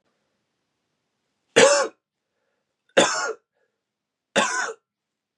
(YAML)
three_cough_length: 5.4 s
three_cough_amplitude: 28627
three_cough_signal_mean_std_ratio: 0.31
survey_phase: beta (2021-08-13 to 2022-03-07)
age: 18-44
gender: Male
wearing_mask: 'Yes'
symptom_runny_or_blocked_nose: true
symptom_headache: true
smoker_status: Never smoked
respiratory_condition_asthma: false
respiratory_condition_other: false
recruitment_source: Test and Trace
submission_delay: 2 days
covid_test_result: Positive
covid_test_method: RT-qPCR
covid_ct_value: 23.2
covid_ct_gene: ORF1ab gene